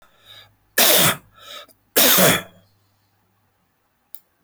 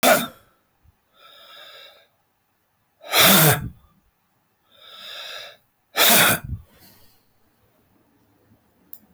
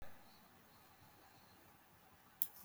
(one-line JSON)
{"three_cough_length": "4.4 s", "three_cough_amplitude": 21139, "three_cough_signal_mean_std_ratio": 0.35, "exhalation_length": "9.1 s", "exhalation_amplitude": 20099, "exhalation_signal_mean_std_ratio": 0.32, "cough_length": "2.6 s", "cough_amplitude": 6452, "cough_signal_mean_std_ratio": 0.33, "survey_phase": "beta (2021-08-13 to 2022-03-07)", "age": "45-64", "gender": "Male", "wearing_mask": "No", "symptom_runny_or_blocked_nose": true, "symptom_fatigue": true, "smoker_status": "Never smoked", "respiratory_condition_asthma": false, "respiratory_condition_other": false, "recruitment_source": "Test and Trace", "submission_delay": "2 days", "covid_test_result": "Positive", "covid_test_method": "RT-qPCR", "covid_ct_value": 24.2, "covid_ct_gene": "N gene", "covid_ct_mean": 24.4, "covid_viral_load": "9800 copies/ml", "covid_viral_load_category": "Minimal viral load (< 10K copies/ml)"}